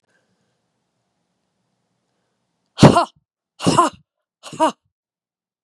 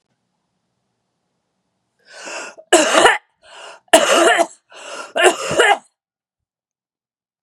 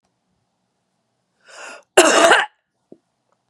{"exhalation_length": "5.6 s", "exhalation_amplitude": 32768, "exhalation_signal_mean_std_ratio": 0.23, "three_cough_length": "7.4 s", "three_cough_amplitude": 32768, "three_cough_signal_mean_std_ratio": 0.37, "cough_length": "3.5 s", "cough_amplitude": 32768, "cough_signal_mean_std_ratio": 0.3, "survey_phase": "beta (2021-08-13 to 2022-03-07)", "age": "45-64", "gender": "Female", "wearing_mask": "No", "symptom_cough_any": true, "symptom_runny_or_blocked_nose": true, "symptom_fatigue": true, "symptom_onset": "7 days", "smoker_status": "Never smoked", "respiratory_condition_asthma": false, "respiratory_condition_other": false, "recruitment_source": "Test and Trace", "submission_delay": "2 days", "covid_test_result": "Positive", "covid_test_method": "RT-qPCR", "covid_ct_value": 22.9, "covid_ct_gene": "ORF1ab gene"}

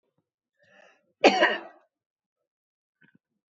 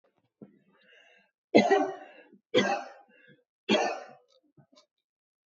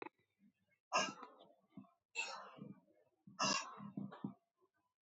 {"cough_length": "3.5 s", "cough_amplitude": 26280, "cough_signal_mean_std_ratio": 0.22, "three_cough_length": "5.5 s", "three_cough_amplitude": 20370, "three_cough_signal_mean_std_ratio": 0.32, "exhalation_length": "5.0 s", "exhalation_amplitude": 2320, "exhalation_signal_mean_std_ratio": 0.39, "survey_phase": "beta (2021-08-13 to 2022-03-07)", "age": "45-64", "gender": "Female", "wearing_mask": "No", "symptom_none": true, "smoker_status": "Never smoked", "respiratory_condition_asthma": false, "respiratory_condition_other": false, "recruitment_source": "REACT", "submission_delay": "3 days", "covid_test_result": "Negative", "covid_test_method": "RT-qPCR", "influenza_a_test_result": "Negative", "influenza_b_test_result": "Negative"}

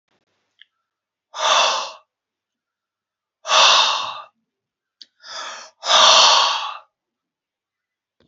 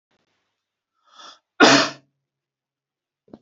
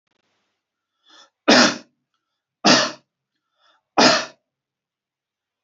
{"exhalation_length": "8.3 s", "exhalation_amplitude": 32768, "exhalation_signal_mean_std_ratio": 0.39, "cough_length": "3.4 s", "cough_amplitude": 29252, "cough_signal_mean_std_ratio": 0.23, "three_cough_length": "5.6 s", "three_cough_amplitude": 30338, "three_cough_signal_mean_std_ratio": 0.29, "survey_phase": "beta (2021-08-13 to 2022-03-07)", "age": "18-44", "gender": "Male", "wearing_mask": "No", "symptom_none": true, "smoker_status": "Never smoked", "respiratory_condition_asthma": false, "respiratory_condition_other": false, "recruitment_source": "Test and Trace", "submission_delay": "0 days", "covid_test_result": "Negative", "covid_test_method": "LFT"}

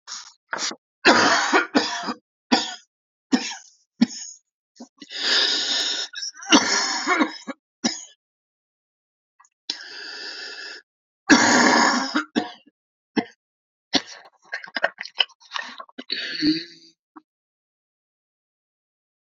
{"three_cough_length": "19.3 s", "three_cough_amplitude": 29105, "three_cough_signal_mean_std_ratio": 0.41, "survey_phase": "alpha (2021-03-01 to 2021-08-12)", "age": "45-64", "gender": "Male", "wearing_mask": "No", "symptom_cough_any": true, "symptom_fever_high_temperature": true, "symptom_headache": true, "symptom_change_to_sense_of_smell_or_taste": true, "symptom_loss_of_taste": true, "symptom_onset": "4 days", "smoker_status": "Ex-smoker", "respiratory_condition_asthma": false, "respiratory_condition_other": false, "recruitment_source": "Test and Trace", "submission_delay": "2 days", "covid_test_result": "Positive", "covid_test_method": "RT-qPCR"}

